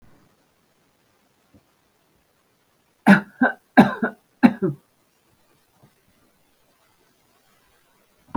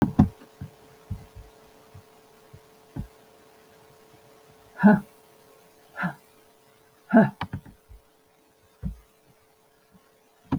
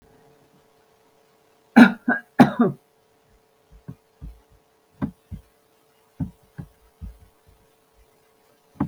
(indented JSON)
{
  "three_cough_length": "8.4 s",
  "three_cough_amplitude": 32768,
  "three_cough_signal_mean_std_ratio": 0.2,
  "exhalation_length": "10.6 s",
  "exhalation_amplitude": 23143,
  "exhalation_signal_mean_std_ratio": 0.24,
  "cough_length": "8.9 s",
  "cough_amplitude": 32768,
  "cough_signal_mean_std_ratio": 0.2,
  "survey_phase": "beta (2021-08-13 to 2022-03-07)",
  "age": "65+",
  "gender": "Female",
  "wearing_mask": "No",
  "symptom_none": true,
  "smoker_status": "Never smoked",
  "respiratory_condition_asthma": false,
  "respiratory_condition_other": false,
  "recruitment_source": "REACT",
  "submission_delay": "14 days",
  "covid_test_result": "Negative",
  "covid_test_method": "RT-qPCR",
  "influenza_a_test_result": "Negative",
  "influenza_b_test_result": "Negative"
}